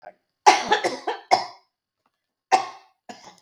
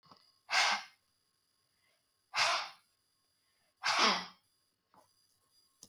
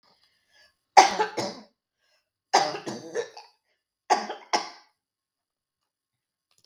{"cough_length": "3.4 s", "cough_amplitude": 32766, "cough_signal_mean_std_ratio": 0.33, "exhalation_length": "5.9 s", "exhalation_amplitude": 6075, "exhalation_signal_mean_std_ratio": 0.34, "three_cough_length": "6.7 s", "three_cough_amplitude": 32768, "three_cough_signal_mean_std_ratio": 0.26, "survey_phase": "beta (2021-08-13 to 2022-03-07)", "age": "65+", "gender": "Female", "wearing_mask": "No", "symptom_none": true, "smoker_status": "Never smoked", "respiratory_condition_asthma": false, "respiratory_condition_other": false, "recruitment_source": "REACT", "submission_delay": "8 days", "covid_test_result": "Negative", "covid_test_method": "RT-qPCR", "influenza_a_test_result": "Negative", "influenza_b_test_result": "Negative"}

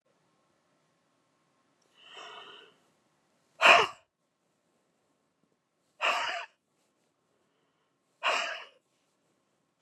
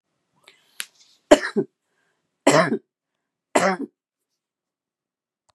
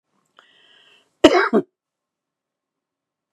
{"exhalation_length": "9.8 s", "exhalation_amplitude": 19417, "exhalation_signal_mean_std_ratio": 0.22, "three_cough_length": "5.5 s", "three_cough_amplitude": 32767, "three_cough_signal_mean_std_ratio": 0.25, "cough_length": "3.3 s", "cough_amplitude": 32768, "cough_signal_mean_std_ratio": 0.23, "survey_phase": "beta (2021-08-13 to 2022-03-07)", "age": "65+", "gender": "Female", "wearing_mask": "No", "symptom_cough_any": true, "symptom_sore_throat": true, "symptom_onset": "12 days", "smoker_status": "Never smoked", "respiratory_condition_asthma": false, "respiratory_condition_other": true, "recruitment_source": "REACT", "submission_delay": "2 days", "covid_test_result": "Negative", "covid_test_method": "RT-qPCR", "influenza_a_test_result": "Negative", "influenza_b_test_result": "Negative"}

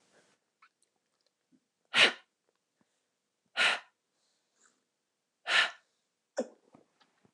{"exhalation_length": "7.3 s", "exhalation_amplitude": 12181, "exhalation_signal_mean_std_ratio": 0.23, "survey_phase": "beta (2021-08-13 to 2022-03-07)", "age": "18-44", "gender": "Female", "wearing_mask": "No", "symptom_none": true, "smoker_status": "Never smoked", "respiratory_condition_asthma": false, "respiratory_condition_other": false, "recruitment_source": "REACT", "submission_delay": "1 day", "covid_test_result": "Negative", "covid_test_method": "RT-qPCR", "influenza_a_test_result": "Negative", "influenza_b_test_result": "Negative"}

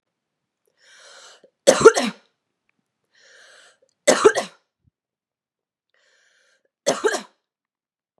{"three_cough_length": "8.2 s", "three_cough_amplitude": 32768, "three_cough_signal_mean_std_ratio": 0.22, "survey_phase": "beta (2021-08-13 to 2022-03-07)", "age": "18-44", "gender": "Female", "wearing_mask": "No", "symptom_cough_any": true, "symptom_runny_or_blocked_nose": true, "symptom_fatigue": true, "symptom_onset": "2 days", "smoker_status": "Ex-smoker", "respiratory_condition_asthma": false, "respiratory_condition_other": false, "recruitment_source": "Test and Trace", "submission_delay": "1 day", "covid_test_result": "Positive", "covid_test_method": "ePCR"}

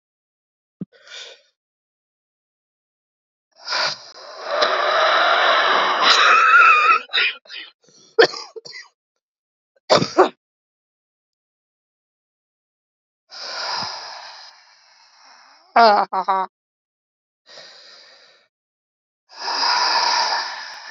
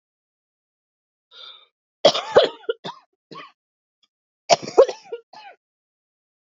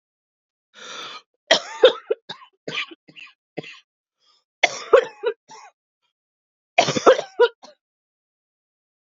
{"exhalation_length": "20.9 s", "exhalation_amplitude": 32767, "exhalation_signal_mean_std_ratio": 0.42, "cough_length": "6.5 s", "cough_amplitude": 30533, "cough_signal_mean_std_ratio": 0.23, "three_cough_length": "9.1 s", "three_cough_amplitude": 29466, "three_cough_signal_mean_std_ratio": 0.26, "survey_phase": "beta (2021-08-13 to 2022-03-07)", "age": "45-64", "gender": "Female", "wearing_mask": "No", "symptom_cough_any": true, "symptom_new_continuous_cough": true, "symptom_runny_or_blocked_nose": true, "symptom_shortness_of_breath": true, "symptom_diarrhoea": true, "symptom_fatigue": true, "symptom_onset": "10 days", "smoker_status": "Never smoked", "respiratory_condition_asthma": true, "respiratory_condition_other": false, "recruitment_source": "Test and Trace", "submission_delay": "5 days", "covid_test_result": "Negative", "covid_test_method": "RT-qPCR"}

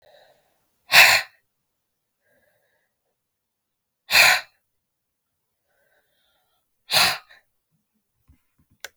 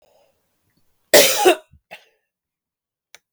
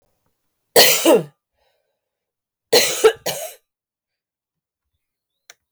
{"exhalation_length": "9.0 s", "exhalation_amplitude": 32768, "exhalation_signal_mean_std_ratio": 0.23, "cough_length": "3.3 s", "cough_amplitude": 32768, "cough_signal_mean_std_ratio": 0.27, "three_cough_length": "5.7 s", "three_cough_amplitude": 32768, "three_cough_signal_mean_std_ratio": 0.31, "survey_phase": "beta (2021-08-13 to 2022-03-07)", "age": "45-64", "gender": "Female", "wearing_mask": "No", "symptom_cough_any": true, "symptom_runny_or_blocked_nose": true, "symptom_sore_throat": true, "symptom_diarrhoea": true, "symptom_fatigue": true, "symptom_headache": true, "smoker_status": "Ex-smoker", "respiratory_condition_asthma": false, "respiratory_condition_other": false, "recruitment_source": "Test and Trace", "submission_delay": "2 days", "covid_test_result": "Positive", "covid_test_method": "ePCR"}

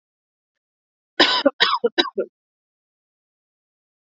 {"cough_length": "4.0 s", "cough_amplitude": 32768, "cough_signal_mean_std_ratio": 0.29, "survey_phase": "alpha (2021-03-01 to 2021-08-12)", "age": "18-44", "gender": "Female", "wearing_mask": "No", "symptom_none": true, "smoker_status": "Never smoked", "respiratory_condition_asthma": false, "respiratory_condition_other": false, "recruitment_source": "REACT", "submission_delay": "1 day", "covid_test_result": "Negative", "covid_test_method": "RT-qPCR"}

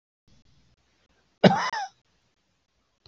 {"cough_length": "3.1 s", "cough_amplitude": 25777, "cough_signal_mean_std_ratio": 0.22, "survey_phase": "beta (2021-08-13 to 2022-03-07)", "age": "65+", "gender": "Male", "wearing_mask": "No", "symptom_runny_or_blocked_nose": true, "symptom_shortness_of_breath": true, "symptom_diarrhoea": true, "smoker_status": "Ex-smoker", "respiratory_condition_asthma": false, "respiratory_condition_other": false, "recruitment_source": "REACT", "submission_delay": "1 day", "covid_test_result": "Negative", "covid_test_method": "RT-qPCR", "influenza_a_test_result": "Negative", "influenza_b_test_result": "Negative"}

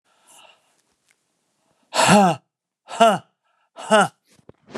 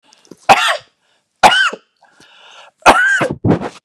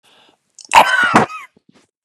{"exhalation_length": "4.8 s", "exhalation_amplitude": 28868, "exhalation_signal_mean_std_ratio": 0.33, "three_cough_length": "3.8 s", "three_cough_amplitude": 32768, "three_cough_signal_mean_std_ratio": 0.46, "cough_length": "2.0 s", "cough_amplitude": 32768, "cough_signal_mean_std_ratio": 0.4, "survey_phase": "beta (2021-08-13 to 2022-03-07)", "age": "45-64", "gender": "Male", "wearing_mask": "No", "symptom_none": true, "smoker_status": "Ex-smoker", "respiratory_condition_asthma": false, "respiratory_condition_other": false, "recruitment_source": "REACT", "submission_delay": "2 days", "covid_test_result": "Negative", "covid_test_method": "RT-qPCR", "influenza_a_test_result": "Negative", "influenza_b_test_result": "Negative"}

